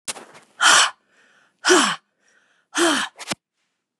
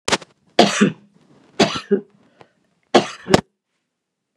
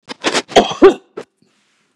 {
  "exhalation_length": "4.0 s",
  "exhalation_amplitude": 32244,
  "exhalation_signal_mean_std_ratio": 0.4,
  "three_cough_length": "4.4 s",
  "three_cough_amplitude": 32768,
  "three_cough_signal_mean_std_ratio": 0.32,
  "cough_length": "2.0 s",
  "cough_amplitude": 32768,
  "cough_signal_mean_std_ratio": 0.35,
  "survey_phase": "beta (2021-08-13 to 2022-03-07)",
  "age": "65+",
  "gender": "Female",
  "wearing_mask": "No",
  "symptom_none": true,
  "smoker_status": "Never smoked",
  "respiratory_condition_asthma": false,
  "respiratory_condition_other": false,
  "recruitment_source": "REACT",
  "submission_delay": "2 days",
  "covid_test_result": "Negative",
  "covid_test_method": "RT-qPCR",
  "influenza_a_test_result": "Negative",
  "influenza_b_test_result": "Negative"
}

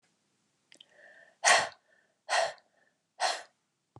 {
  "exhalation_length": "4.0 s",
  "exhalation_amplitude": 11393,
  "exhalation_signal_mean_std_ratio": 0.3,
  "survey_phase": "beta (2021-08-13 to 2022-03-07)",
  "age": "45-64",
  "gender": "Female",
  "wearing_mask": "No",
  "symptom_none": true,
  "smoker_status": "Ex-smoker",
  "respiratory_condition_asthma": false,
  "respiratory_condition_other": false,
  "recruitment_source": "REACT",
  "submission_delay": "2 days",
  "covid_test_result": "Negative",
  "covid_test_method": "RT-qPCR",
  "influenza_a_test_result": "Unknown/Void",
  "influenza_b_test_result": "Unknown/Void"
}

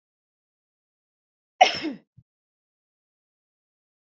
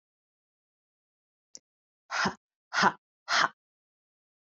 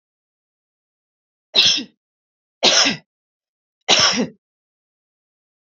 {
  "cough_length": "4.2 s",
  "cough_amplitude": 27479,
  "cough_signal_mean_std_ratio": 0.15,
  "exhalation_length": "4.5 s",
  "exhalation_amplitude": 12537,
  "exhalation_signal_mean_std_ratio": 0.26,
  "three_cough_length": "5.6 s",
  "three_cough_amplitude": 32768,
  "three_cough_signal_mean_std_ratio": 0.33,
  "survey_phase": "beta (2021-08-13 to 2022-03-07)",
  "age": "45-64",
  "gender": "Female",
  "wearing_mask": "No",
  "symptom_none": true,
  "smoker_status": "Never smoked",
  "respiratory_condition_asthma": false,
  "respiratory_condition_other": false,
  "recruitment_source": "REACT",
  "submission_delay": "4 days",
  "covid_test_result": "Negative",
  "covid_test_method": "RT-qPCR",
  "influenza_a_test_result": "Negative",
  "influenza_b_test_result": "Negative"
}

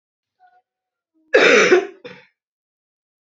{
  "cough_length": "3.2 s",
  "cough_amplitude": 28582,
  "cough_signal_mean_std_ratio": 0.33,
  "survey_phase": "beta (2021-08-13 to 2022-03-07)",
  "age": "18-44",
  "gender": "Female",
  "wearing_mask": "No",
  "symptom_cough_any": true,
  "symptom_runny_or_blocked_nose": true,
  "symptom_sore_throat": true,
  "symptom_fatigue": true,
  "symptom_fever_high_temperature": true,
  "symptom_onset": "3 days",
  "smoker_status": "Ex-smoker",
  "respiratory_condition_asthma": false,
  "respiratory_condition_other": false,
  "recruitment_source": "REACT",
  "submission_delay": "1 day",
  "covid_test_result": "Negative",
  "covid_test_method": "RT-qPCR",
  "influenza_a_test_result": "Unknown/Void",
  "influenza_b_test_result": "Unknown/Void"
}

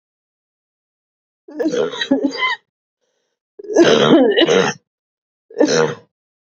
{
  "three_cough_length": "6.6 s",
  "three_cough_amplitude": 29673,
  "three_cough_signal_mean_std_ratio": 0.47,
  "survey_phase": "beta (2021-08-13 to 2022-03-07)",
  "age": "18-44",
  "gender": "Female",
  "wearing_mask": "No",
  "symptom_cough_any": true,
  "symptom_runny_or_blocked_nose": true,
  "symptom_sore_throat": true,
  "symptom_diarrhoea": true,
  "symptom_fatigue": true,
  "symptom_fever_high_temperature": true,
  "symptom_headache": true,
  "symptom_change_to_sense_of_smell_or_taste": true,
  "symptom_loss_of_taste": true,
  "symptom_onset": "4 days",
  "smoker_status": "Ex-smoker",
  "respiratory_condition_asthma": true,
  "respiratory_condition_other": false,
  "recruitment_source": "Test and Trace",
  "submission_delay": "1 day",
  "covid_test_result": "Positive",
  "covid_test_method": "RT-qPCR",
  "covid_ct_value": 15.4,
  "covid_ct_gene": "ORF1ab gene"
}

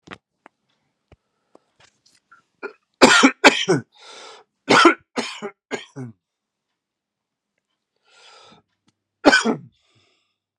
{
  "three_cough_length": "10.6 s",
  "three_cough_amplitude": 32768,
  "three_cough_signal_mean_std_ratio": 0.26,
  "survey_phase": "beta (2021-08-13 to 2022-03-07)",
  "age": "45-64",
  "gender": "Male",
  "wearing_mask": "No",
  "symptom_new_continuous_cough": true,
  "symptom_runny_or_blocked_nose": true,
  "symptom_shortness_of_breath": true,
  "symptom_sore_throat": true,
  "symptom_fatigue": true,
  "symptom_headache": true,
  "symptom_change_to_sense_of_smell_or_taste": true,
  "symptom_onset": "3 days",
  "smoker_status": "Never smoked",
  "respiratory_condition_asthma": false,
  "respiratory_condition_other": false,
  "recruitment_source": "Test and Trace",
  "submission_delay": "1 day",
  "covid_test_result": "Positive",
  "covid_test_method": "ePCR"
}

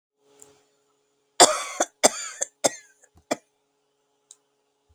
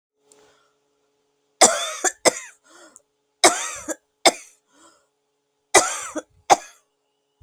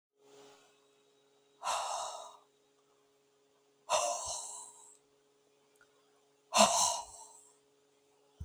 {
  "cough_length": "4.9 s",
  "cough_amplitude": 32768,
  "cough_signal_mean_std_ratio": 0.22,
  "three_cough_length": "7.4 s",
  "three_cough_amplitude": 32768,
  "three_cough_signal_mean_std_ratio": 0.26,
  "exhalation_length": "8.4 s",
  "exhalation_amplitude": 10765,
  "exhalation_signal_mean_std_ratio": 0.33,
  "survey_phase": "beta (2021-08-13 to 2022-03-07)",
  "age": "45-64",
  "gender": "Female",
  "wearing_mask": "No",
  "symptom_other": true,
  "smoker_status": "Never smoked",
  "respiratory_condition_asthma": true,
  "respiratory_condition_other": false,
  "recruitment_source": "REACT",
  "submission_delay": "1 day",
  "covid_test_result": "Negative",
  "covid_test_method": "RT-qPCR",
  "influenza_a_test_result": "Negative",
  "influenza_b_test_result": "Negative"
}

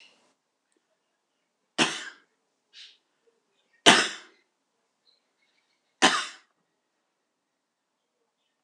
{
  "three_cough_length": "8.6 s",
  "three_cough_amplitude": 26027,
  "three_cough_signal_mean_std_ratio": 0.19,
  "survey_phase": "beta (2021-08-13 to 2022-03-07)",
  "age": "45-64",
  "gender": "Female",
  "wearing_mask": "No",
  "symptom_none": true,
  "smoker_status": "Current smoker (11 or more cigarettes per day)",
  "respiratory_condition_asthma": false,
  "respiratory_condition_other": false,
  "recruitment_source": "REACT",
  "submission_delay": "2 days",
  "covid_test_result": "Negative",
  "covid_test_method": "RT-qPCR"
}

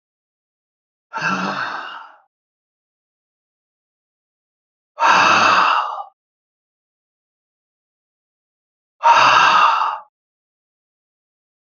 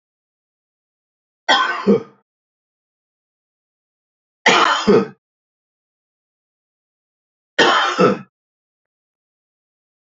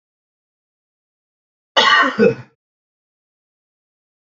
{
  "exhalation_length": "11.6 s",
  "exhalation_amplitude": 28455,
  "exhalation_signal_mean_std_ratio": 0.37,
  "three_cough_length": "10.2 s",
  "three_cough_amplitude": 28889,
  "three_cough_signal_mean_std_ratio": 0.31,
  "cough_length": "4.3 s",
  "cough_amplitude": 30342,
  "cough_signal_mean_std_ratio": 0.28,
  "survey_phase": "beta (2021-08-13 to 2022-03-07)",
  "age": "65+",
  "gender": "Male",
  "wearing_mask": "No",
  "symptom_none": true,
  "smoker_status": "Ex-smoker",
  "respiratory_condition_asthma": false,
  "respiratory_condition_other": false,
  "recruitment_source": "REACT",
  "submission_delay": "2 days",
  "covid_test_result": "Negative",
  "covid_test_method": "RT-qPCR",
  "influenza_a_test_result": "Negative",
  "influenza_b_test_result": "Negative"
}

